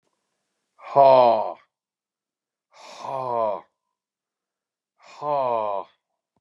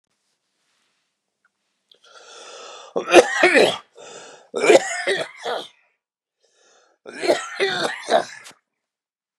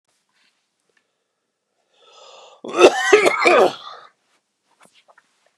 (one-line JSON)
{"exhalation_length": "6.4 s", "exhalation_amplitude": 25073, "exhalation_signal_mean_std_ratio": 0.35, "three_cough_length": "9.4 s", "three_cough_amplitude": 32768, "three_cough_signal_mean_std_ratio": 0.35, "cough_length": "5.6 s", "cough_amplitude": 32768, "cough_signal_mean_std_ratio": 0.31, "survey_phase": "beta (2021-08-13 to 2022-03-07)", "age": "65+", "gender": "Male", "wearing_mask": "No", "symptom_cough_any": true, "smoker_status": "Never smoked", "respiratory_condition_asthma": false, "respiratory_condition_other": false, "recruitment_source": "REACT", "submission_delay": "4 days", "covid_test_result": "Positive", "covid_test_method": "RT-qPCR", "covid_ct_value": 30.0, "covid_ct_gene": "E gene", "influenza_a_test_result": "Negative", "influenza_b_test_result": "Negative"}